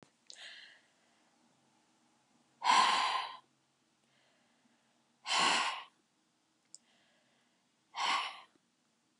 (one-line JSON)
{"exhalation_length": "9.2 s", "exhalation_amplitude": 5627, "exhalation_signal_mean_std_ratio": 0.33, "survey_phase": "beta (2021-08-13 to 2022-03-07)", "age": "65+", "gender": "Female", "wearing_mask": "No", "symptom_none": true, "smoker_status": "Never smoked", "respiratory_condition_asthma": false, "respiratory_condition_other": false, "recruitment_source": "REACT", "submission_delay": "1 day", "covid_test_result": "Negative", "covid_test_method": "RT-qPCR", "influenza_a_test_result": "Negative", "influenza_b_test_result": "Negative"}